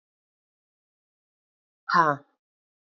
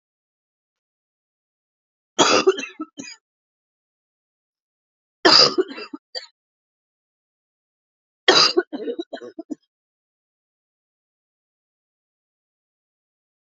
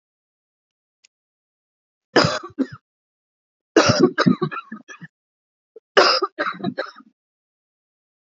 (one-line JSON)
{"exhalation_length": "2.8 s", "exhalation_amplitude": 18444, "exhalation_signal_mean_std_ratio": 0.22, "three_cough_length": "13.5 s", "three_cough_amplitude": 32768, "three_cough_signal_mean_std_ratio": 0.23, "cough_length": "8.3 s", "cough_amplitude": 28855, "cough_signal_mean_std_ratio": 0.31, "survey_phase": "beta (2021-08-13 to 2022-03-07)", "age": "45-64", "gender": "Female", "wearing_mask": "No", "symptom_cough_any": true, "symptom_runny_or_blocked_nose": true, "symptom_sore_throat": true, "symptom_fatigue": true, "symptom_headache": true, "symptom_change_to_sense_of_smell_or_taste": true, "symptom_loss_of_taste": true, "symptom_onset": "4 days", "smoker_status": "Ex-smoker", "respiratory_condition_asthma": false, "respiratory_condition_other": false, "recruitment_source": "Test and Trace", "submission_delay": "2 days", "covid_test_result": "Positive", "covid_test_method": "RT-qPCR", "covid_ct_value": 25.5, "covid_ct_gene": "ORF1ab gene", "covid_ct_mean": 26.1, "covid_viral_load": "2800 copies/ml", "covid_viral_load_category": "Minimal viral load (< 10K copies/ml)"}